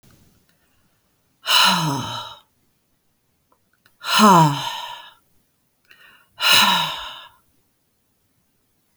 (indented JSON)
{
  "exhalation_length": "9.0 s",
  "exhalation_amplitude": 31506,
  "exhalation_signal_mean_std_ratio": 0.36,
  "survey_phase": "alpha (2021-03-01 to 2021-08-12)",
  "age": "45-64",
  "gender": "Female",
  "wearing_mask": "No",
  "symptom_none": true,
  "smoker_status": "Ex-smoker",
  "respiratory_condition_asthma": false,
  "respiratory_condition_other": false,
  "recruitment_source": "REACT",
  "submission_delay": "5 days",
  "covid_test_result": "Negative",
  "covid_test_method": "RT-qPCR"
}